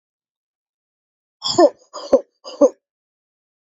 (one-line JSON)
{"exhalation_length": "3.7 s", "exhalation_amplitude": 27777, "exhalation_signal_mean_std_ratio": 0.25, "survey_phase": "beta (2021-08-13 to 2022-03-07)", "age": "18-44", "gender": "Female", "wearing_mask": "No", "symptom_cough_any": true, "symptom_runny_or_blocked_nose": true, "symptom_sore_throat": true, "symptom_abdominal_pain": true, "symptom_diarrhoea": true, "symptom_headache": true, "symptom_onset": "4 days", "smoker_status": "Never smoked", "respiratory_condition_asthma": false, "respiratory_condition_other": false, "recruitment_source": "Test and Trace", "submission_delay": "1 day", "covid_test_result": "Positive", "covid_test_method": "RT-qPCR", "covid_ct_value": 31.2, "covid_ct_gene": "ORF1ab gene"}